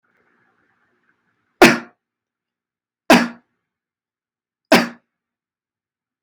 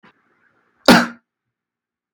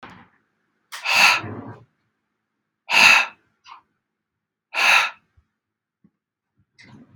{
  "three_cough_length": "6.2 s",
  "three_cough_amplitude": 32768,
  "three_cough_signal_mean_std_ratio": 0.21,
  "cough_length": "2.1 s",
  "cough_amplitude": 32768,
  "cough_signal_mean_std_ratio": 0.23,
  "exhalation_length": "7.2 s",
  "exhalation_amplitude": 32768,
  "exhalation_signal_mean_std_ratio": 0.32,
  "survey_phase": "beta (2021-08-13 to 2022-03-07)",
  "age": "18-44",
  "gender": "Male",
  "wearing_mask": "No",
  "symptom_none": true,
  "smoker_status": "Never smoked",
  "respiratory_condition_asthma": false,
  "respiratory_condition_other": false,
  "recruitment_source": "REACT",
  "submission_delay": "1 day",
  "covid_test_result": "Negative",
  "covid_test_method": "RT-qPCR",
  "influenza_a_test_result": "Negative",
  "influenza_b_test_result": "Negative"
}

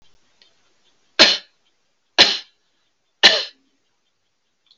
{
  "three_cough_length": "4.8 s",
  "three_cough_amplitude": 32767,
  "three_cough_signal_mean_std_ratio": 0.25,
  "survey_phase": "alpha (2021-03-01 to 2021-08-12)",
  "age": "65+",
  "gender": "Female",
  "wearing_mask": "No",
  "symptom_none": true,
  "smoker_status": "Never smoked",
  "respiratory_condition_asthma": false,
  "respiratory_condition_other": false,
  "recruitment_source": "REACT",
  "submission_delay": "14 days",
  "covid_test_result": "Negative",
  "covid_test_method": "RT-qPCR"
}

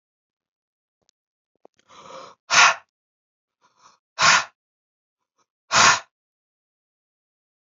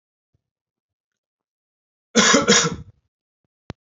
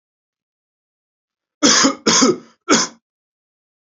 {
  "exhalation_length": "7.7 s",
  "exhalation_amplitude": 28751,
  "exhalation_signal_mean_std_ratio": 0.24,
  "cough_length": "3.9 s",
  "cough_amplitude": 29998,
  "cough_signal_mean_std_ratio": 0.3,
  "three_cough_length": "3.9 s",
  "three_cough_amplitude": 32767,
  "three_cough_signal_mean_std_ratio": 0.37,
  "survey_phase": "alpha (2021-03-01 to 2021-08-12)",
  "age": "18-44",
  "gender": "Male",
  "wearing_mask": "No",
  "symptom_none": true,
  "symptom_onset": "13 days",
  "smoker_status": "Never smoked",
  "respiratory_condition_asthma": false,
  "respiratory_condition_other": false,
  "recruitment_source": "REACT",
  "submission_delay": "1 day",
  "covid_test_result": "Negative",
  "covid_test_method": "RT-qPCR"
}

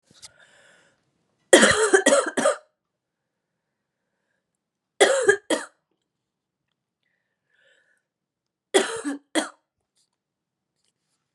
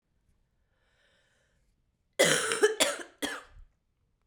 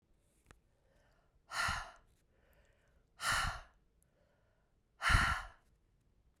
{
  "three_cough_length": "11.3 s",
  "three_cough_amplitude": 32768,
  "three_cough_signal_mean_std_ratio": 0.28,
  "cough_length": "4.3 s",
  "cough_amplitude": 16587,
  "cough_signal_mean_std_ratio": 0.33,
  "exhalation_length": "6.4 s",
  "exhalation_amplitude": 5936,
  "exhalation_signal_mean_std_ratio": 0.33,
  "survey_phase": "beta (2021-08-13 to 2022-03-07)",
  "age": "18-44",
  "gender": "Female",
  "wearing_mask": "No",
  "symptom_cough_any": true,
  "symptom_runny_or_blocked_nose": true,
  "symptom_fatigue": true,
  "symptom_headache": true,
  "symptom_onset": "2 days",
  "smoker_status": "Ex-smoker",
  "respiratory_condition_asthma": false,
  "respiratory_condition_other": false,
  "recruitment_source": "Test and Trace",
  "submission_delay": "1 day",
  "covid_test_result": "Positive",
  "covid_test_method": "ePCR"
}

